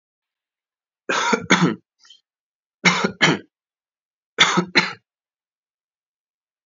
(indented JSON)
{
  "three_cough_length": "6.7 s",
  "three_cough_amplitude": 30588,
  "three_cough_signal_mean_std_ratio": 0.34,
  "survey_phase": "alpha (2021-03-01 to 2021-08-12)",
  "age": "18-44",
  "gender": "Male",
  "wearing_mask": "No",
  "symptom_cough_any": true,
  "symptom_fatigue": true,
  "symptom_fever_high_temperature": true,
  "smoker_status": "Never smoked",
  "respiratory_condition_asthma": false,
  "respiratory_condition_other": false,
  "recruitment_source": "Test and Trace",
  "submission_delay": "2 days",
  "covid_test_result": "Positive",
  "covid_test_method": "LFT"
}